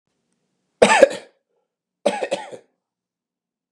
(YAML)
cough_length: 3.7 s
cough_amplitude: 32768
cough_signal_mean_std_ratio: 0.26
survey_phase: beta (2021-08-13 to 2022-03-07)
age: 45-64
gender: Male
wearing_mask: 'No'
symptom_none: true
symptom_onset: 13 days
smoker_status: Ex-smoker
respiratory_condition_asthma: false
respiratory_condition_other: false
recruitment_source: REACT
submission_delay: 3 days
covid_test_result: Negative
covid_test_method: RT-qPCR
influenza_a_test_result: Negative
influenza_b_test_result: Negative